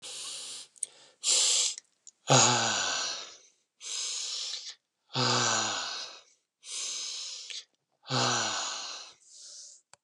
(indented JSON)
{
  "exhalation_length": "10.0 s",
  "exhalation_amplitude": 11844,
  "exhalation_signal_mean_std_ratio": 0.56,
  "survey_phase": "beta (2021-08-13 to 2022-03-07)",
  "age": "65+",
  "gender": "Male",
  "wearing_mask": "No",
  "symptom_none": true,
  "smoker_status": "Never smoked",
  "respiratory_condition_asthma": false,
  "respiratory_condition_other": false,
  "recruitment_source": "REACT",
  "submission_delay": "1 day",
  "covid_test_result": "Negative",
  "covid_test_method": "RT-qPCR",
  "influenza_a_test_result": "Negative",
  "influenza_b_test_result": "Negative"
}